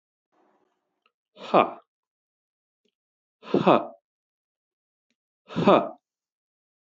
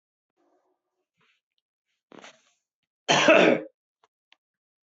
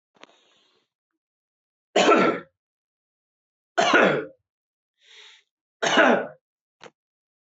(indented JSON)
{
  "exhalation_length": "6.9 s",
  "exhalation_amplitude": 21118,
  "exhalation_signal_mean_std_ratio": 0.23,
  "cough_length": "4.9 s",
  "cough_amplitude": 20043,
  "cough_signal_mean_std_ratio": 0.25,
  "three_cough_length": "7.4 s",
  "three_cough_amplitude": 21968,
  "three_cough_signal_mean_std_ratio": 0.33,
  "survey_phase": "beta (2021-08-13 to 2022-03-07)",
  "age": "45-64",
  "gender": "Male",
  "wearing_mask": "No",
  "symptom_none": true,
  "smoker_status": "Never smoked",
  "respiratory_condition_asthma": false,
  "respiratory_condition_other": false,
  "recruitment_source": "REACT",
  "submission_delay": "0 days",
  "covid_test_result": "Negative",
  "covid_test_method": "RT-qPCR",
  "influenza_a_test_result": "Negative",
  "influenza_b_test_result": "Negative"
}